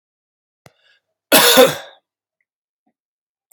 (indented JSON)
{
  "cough_length": "3.5 s",
  "cough_amplitude": 32768,
  "cough_signal_mean_std_ratio": 0.28,
  "survey_phase": "beta (2021-08-13 to 2022-03-07)",
  "age": "18-44",
  "gender": "Male",
  "wearing_mask": "No",
  "symptom_cough_any": true,
  "symptom_runny_or_blocked_nose": true,
  "symptom_sore_throat": true,
  "symptom_diarrhoea": true,
  "symptom_fatigue": true,
  "symptom_fever_high_temperature": true,
  "symptom_headache": true,
  "symptom_change_to_sense_of_smell_or_taste": true,
  "symptom_loss_of_taste": true,
  "smoker_status": "Never smoked",
  "respiratory_condition_asthma": false,
  "respiratory_condition_other": false,
  "recruitment_source": "Test and Trace",
  "submission_delay": "2 days",
  "covid_test_result": "Positive",
  "covid_test_method": "RT-qPCR",
  "covid_ct_value": 27.0,
  "covid_ct_gene": "ORF1ab gene",
  "covid_ct_mean": 27.6,
  "covid_viral_load": "890 copies/ml",
  "covid_viral_load_category": "Minimal viral load (< 10K copies/ml)"
}